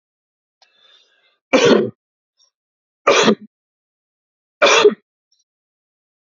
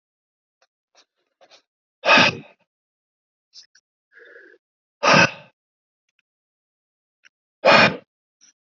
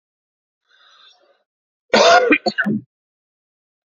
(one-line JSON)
{"three_cough_length": "6.2 s", "three_cough_amplitude": 31102, "three_cough_signal_mean_std_ratio": 0.31, "exhalation_length": "8.8 s", "exhalation_amplitude": 27851, "exhalation_signal_mean_std_ratio": 0.25, "cough_length": "3.8 s", "cough_amplitude": 28696, "cough_signal_mean_std_ratio": 0.34, "survey_phase": "beta (2021-08-13 to 2022-03-07)", "age": "18-44", "gender": "Male", "wearing_mask": "No", "symptom_none": true, "smoker_status": "Ex-smoker", "respiratory_condition_asthma": false, "respiratory_condition_other": false, "recruitment_source": "REACT", "submission_delay": "1 day", "covid_test_result": "Negative", "covid_test_method": "RT-qPCR", "influenza_a_test_result": "Negative", "influenza_b_test_result": "Negative"}